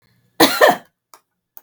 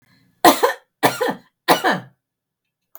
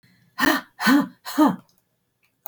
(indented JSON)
{
  "cough_length": "1.6 s",
  "cough_amplitude": 32768,
  "cough_signal_mean_std_ratio": 0.34,
  "three_cough_length": "3.0 s",
  "three_cough_amplitude": 32766,
  "three_cough_signal_mean_std_ratio": 0.37,
  "exhalation_length": "2.5 s",
  "exhalation_amplitude": 17344,
  "exhalation_signal_mean_std_ratio": 0.43,
  "survey_phase": "beta (2021-08-13 to 2022-03-07)",
  "age": "45-64",
  "gender": "Female",
  "wearing_mask": "No",
  "symptom_none": true,
  "symptom_onset": "7 days",
  "smoker_status": "Ex-smoker",
  "respiratory_condition_asthma": false,
  "respiratory_condition_other": false,
  "recruitment_source": "REACT",
  "submission_delay": "1 day",
  "covid_test_result": "Negative",
  "covid_test_method": "RT-qPCR",
  "influenza_a_test_result": "Unknown/Void",
  "influenza_b_test_result": "Unknown/Void"
}